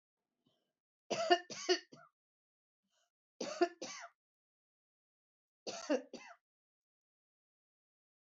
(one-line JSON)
{"three_cough_length": "8.4 s", "three_cough_amplitude": 6212, "three_cough_signal_mean_std_ratio": 0.25, "survey_phase": "beta (2021-08-13 to 2022-03-07)", "age": "65+", "gender": "Female", "wearing_mask": "No", "symptom_none": true, "smoker_status": "Never smoked", "respiratory_condition_asthma": false, "respiratory_condition_other": false, "recruitment_source": "REACT", "submission_delay": "0 days", "covid_test_result": "Negative", "covid_test_method": "RT-qPCR", "influenza_a_test_result": "Negative", "influenza_b_test_result": "Negative"}